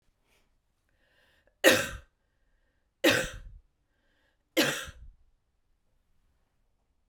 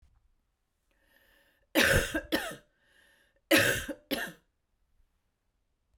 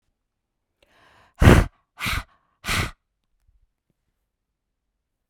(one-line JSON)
{"three_cough_length": "7.1 s", "three_cough_amplitude": 19101, "three_cough_signal_mean_std_ratio": 0.25, "cough_length": "6.0 s", "cough_amplitude": 10579, "cough_signal_mean_std_ratio": 0.33, "exhalation_length": "5.3 s", "exhalation_amplitude": 32768, "exhalation_signal_mean_std_ratio": 0.23, "survey_phase": "alpha (2021-03-01 to 2021-08-12)", "age": "45-64", "gender": "Female", "wearing_mask": "No", "symptom_none": true, "smoker_status": "Never smoked", "respiratory_condition_asthma": true, "respiratory_condition_other": false, "recruitment_source": "Test and Trace", "submission_delay": "0 days", "covid_test_result": "Negative", "covid_test_method": "ePCR"}